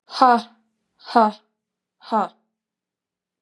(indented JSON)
{
  "exhalation_length": "3.4 s",
  "exhalation_amplitude": 31170,
  "exhalation_signal_mean_std_ratio": 0.3,
  "survey_phase": "beta (2021-08-13 to 2022-03-07)",
  "age": "18-44",
  "gender": "Female",
  "wearing_mask": "No",
  "symptom_runny_or_blocked_nose": true,
  "symptom_fatigue": true,
  "smoker_status": "Never smoked",
  "respiratory_condition_asthma": false,
  "respiratory_condition_other": false,
  "recruitment_source": "Test and Trace",
  "submission_delay": "0 days",
  "covid_test_result": "Positive",
  "covid_test_method": "LFT"
}